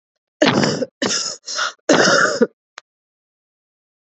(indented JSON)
{
  "three_cough_length": "4.0 s",
  "three_cough_amplitude": 32235,
  "three_cough_signal_mean_std_ratio": 0.48,
  "survey_phase": "beta (2021-08-13 to 2022-03-07)",
  "age": "18-44",
  "gender": "Female",
  "wearing_mask": "No",
  "symptom_cough_any": true,
  "symptom_runny_or_blocked_nose": true,
  "symptom_shortness_of_breath": true,
  "symptom_sore_throat": true,
  "symptom_fatigue": true,
  "symptom_headache": true,
  "smoker_status": "Never smoked",
  "respiratory_condition_asthma": false,
  "respiratory_condition_other": false,
  "recruitment_source": "Test and Trace",
  "submission_delay": "2 days",
  "covid_test_result": "Positive",
  "covid_test_method": "RT-qPCR",
  "covid_ct_value": 27.6,
  "covid_ct_gene": "ORF1ab gene",
  "covid_ct_mean": 27.9,
  "covid_viral_load": "700 copies/ml",
  "covid_viral_load_category": "Minimal viral load (< 10K copies/ml)"
}